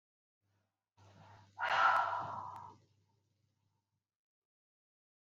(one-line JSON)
{"exhalation_length": "5.4 s", "exhalation_amplitude": 3730, "exhalation_signal_mean_std_ratio": 0.31, "survey_phase": "beta (2021-08-13 to 2022-03-07)", "age": "45-64", "gender": "Female", "wearing_mask": "No", "symptom_cough_any": true, "symptom_headache": true, "symptom_change_to_sense_of_smell_or_taste": true, "symptom_loss_of_taste": true, "smoker_status": "Ex-smoker", "respiratory_condition_asthma": false, "respiratory_condition_other": false, "recruitment_source": "REACT", "submission_delay": "9 days", "covid_test_result": "Negative", "covid_test_method": "RT-qPCR"}